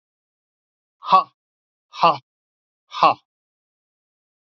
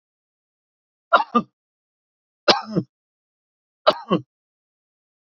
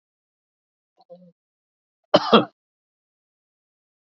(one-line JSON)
{"exhalation_length": "4.4 s", "exhalation_amplitude": 27953, "exhalation_signal_mean_std_ratio": 0.23, "three_cough_length": "5.4 s", "three_cough_amplitude": 30454, "three_cough_signal_mean_std_ratio": 0.23, "cough_length": "4.0 s", "cough_amplitude": 28391, "cough_signal_mean_std_ratio": 0.17, "survey_phase": "beta (2021-08-13 to 2022-03-07)", "age": "65+", "gender": "Male", "wearing_mask": "No", "symptom_none": true, "smoker_status": "Ex-smoker", "respiratory_condition_asthma": false, "respiratory_condition_other": false, "recruitment_source": "REACT", "submission_delay": "3 days", "covid_test_result": "Negative", "covid_test_method": "RT-qPCR", "influenza_a_test_result": "Negative", "influenza_b_test_result": "Negative"}